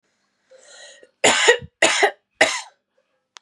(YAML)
three_cough_length: 3.4 s
three_cough_amplitude: 32520
three_cough_signal_mean_std_ratio: 0.38
survey_phase: beta (2021-08-13 to 2022-03-07)
age: 18-44
gender: Female
wearing_mask: 'No'
symptom_headache: true
symptom_change_to_sense_of_smell_or_taste: true
smoker_status: Ex-smoker
respiratory_condition_asthma: false
respiratory_condition_other: false
recruitment_source: REACT
submission_delay: 2 days
covid_test_result: Negative
covid_test_method: RT-qPCR
influenza_a_test_result: Negative
influenza_b_test_result: Negative